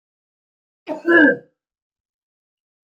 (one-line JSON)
{"cough_length": "3.0 s", "cough_amplitude": 24756, "cough_signal_mean_std_ratio": 0.27, "survey_phase": "alpha (2021-03-01 to 2021-08-12)", "age": "45-64", "gender": "Male", "wearing_mask": "No", "symptom_none": true, "smoker_status": "Never smoked", "respiratory_condition_asthma": false, "respiratory_condition_other": false, "recruitment_source": "REACT", "submission_delay": "2 days", "covid_test_result": "Negative", "covid_test_method": "RT-qPCR"}